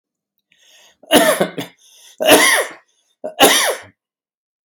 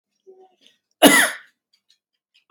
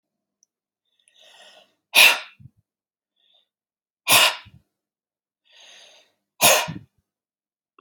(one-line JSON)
{"three_cough_length": "4.6 s", "three_cough_amplitude": 32768, "three_cough_signal_mean_std_ratio": 0.42, "cough_length": "2.5 s", "cough_amplitude": 32767, "cough_signal_mean_std_ratio": 0.26, "exhalation_length": "7.8 s", "exhalation_amplitude": 32033, "exhalation_signal_mean_std_ratio": 0.24, "survey_phase": "beta (2021-08-13 to 2022-03-07)", "age": "45-64", "gender": "Male", "wearing_mask": "No", "symptom_cough_any": true, "symptom_sore_throat": true, "symptom_onset": "4 days", "smoker_status": "Ex-smoker", "respiratory_condition_asthma": true, "respiratory_condition_other": false, "recruitment_source": "REACT", "submission_delay": "5 days", "covid_test_result": "Negative", "covid_test_method": "RT-qPCR", "influenza_a_test_result": "Negative", "influenza_b_test_result": "Negative"}